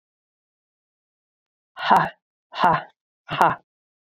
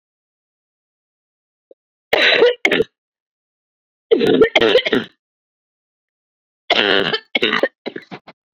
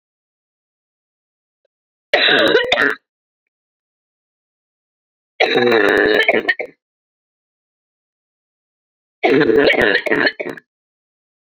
{"exhalation_length": "4.0 s", "exhalation_amplitude": 30753, "exhalation_signal_mean_std_ratio": 0.31, "cough_length": "8.5 s", "cough_amplitude": 32767, "cough_signal_mean_std_ratio": 0.39, "three_cough_length": "11.4 s", "three_cough_amplitude": 32767, "three_cough_signal_mean_std_ratio": 0.41, "survey_phase": "beta (2021-08-13 to 2022-03-07)", "age": "45-64", "gender": "Female", "wearing_mask": "No", "symptom_cough_any": true, "symptom_shortness_of_breath": true, "symptom_sore_throat": true, "symptom_fatigue": true, "symptom_headache": true, "smoker_status": "Never smoked", "respiratory_condition_asthma": true, "respiratory_condition_other": false, "recruitment_source": "Test and Trace", "submission_delay": "1 day", "covid_test_result": "Positive", "covid_test_method": "RT-qPCR", "covid_ct_value": 19.6, "covid_ct_gene": "ORF1ab gene", "covid_ct_mean": 20.5, "covid_viral_load": "180000 copies/ml", "covid_viral_load_category": "Low viral load (10K-1M copies/ml)"}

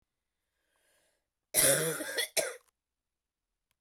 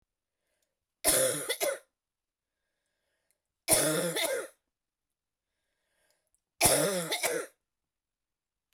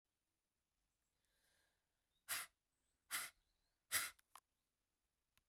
{"cough_length": "3.8 s", "cough_amplitude": 10892, "cough_signal_mean_std_ratio": 0.34, "three_cough_length": "8.7 s", "three_cough_amplitude": 11909, "three_cough_signal_mean_std_ratio": 0.39, "exhalation_length": "5.5 s", "exhalation_amplitude": 1516, "exhalation_signal_mean_std_ratio": 0.24, "survey_phase": "beta (2021-08-13 to 2022-03-07)", "age": "45-64", "gender": "Female", "wearing_mask": "No", "symptom_cough_any": true, "symptom_new_continuous_cough": true, "symptom_runny_or_blocked_nose": true, "symptom_sore_throat": true, "symptom_fever_high_temperature": true, "symptom_headache": true, "symptom_change_to_sense_of_smell_or_taste": true, "smoker_status": "Never smoked", "respiratory_condition_asthma": false, "respiratory_condition_other": false, "recruitment_source": "Test and Trace", "submission_delay": "1 day", "covid_test_result": "Positive", "covid_test_method": "RT-qPCR", "covid_ct_value": 20.9, "covid_ct_gene": "ORF1ab gene"}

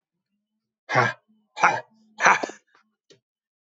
{"exhalation_length": "3.8 s", "exhalation_amplitude": 25364, "exhalation_signal_mean_std_ratio": 0.29, "survey_phase": "beta (2021-08-13 to 2022-03-07)", "age": "45-64", "gender": "Male", "wearing_mask": "No", "symptom_fatigue": true, "symptom_onset": "12 days", "smoker_status": "Never smoked", "respiratory_condition_asthma": false, "respiratory_condition_other": false, "recruitment_source": "REACT", "submission_delay": "1 day", "covid_test_result": "Negative", "covid_test_method": "RT-qPCR"}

